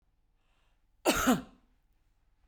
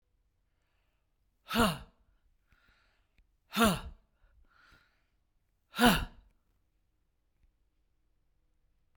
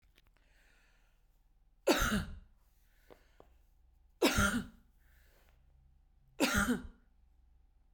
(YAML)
cough_length: 2.5 s
cough_amplitude: 8445
cough_signal_mean_std_ratio: 0.3
exhalation_length: 9.0 s
exhalation_amplitude: 10123
exhalation_signal_mean_std_ratio: 0.24
three_cough_length: 7.9 s
three_cough_amplitude: 7060
three_cough_signal_mean_std_ratio: 0.34
survey_phase: beta (2021-08-13 to 2022-03-07)
age: 45-64
gender: Female
wearing_mask: 'No'
symptom_none: true
smoker_status: Ex-smoker
respiratory_condition_asthma: true
respiratory_condition_other: false
recruitment_source: REACT
submission_delay: 1 day
covid_test_result: Negative
covid_test_method: RT-qPCR